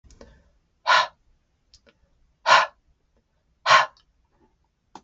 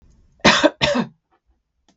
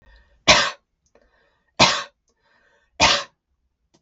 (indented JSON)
{
  "exhalation_length": "5.0 s",
  "exhalation_amplitude": 31066,
  "exhalation_signal_mean_std_ratio": 0.27,
  "cough_length": "2.0 s",
  "cough_amplitude": 32768,
  "cough_signal_mean_std_ratio": 0.38,
  "three_cough_length": "4.0 s",
  "three_cough_amplitude": 32768,
  "three_cough_signal_mean_std_ratio": 0.3,
  "survey_phase": "beta (2021-08-13 to 2022-03-07)",
  "age": "45-64",
  "gender": "Female",
  "wearing_mask": "No",
  "symptom_runny_or_blocked_nose": true,
  "symptom_onset": "12 days",
  "smoker_status": "Ex-smoker",
  "respiratory_condition_asthma": false,
  "respiratory_condition_other": false,
  "recruitment_source": "REACT",
  "submission_delay": "2 days",
  "covid_test_result": "Negative",
  "covid_test_method": "RT-qPCR",
  "influenza_a_test_result": "Negative",
  "influenza_b_test_result": "Negative"
}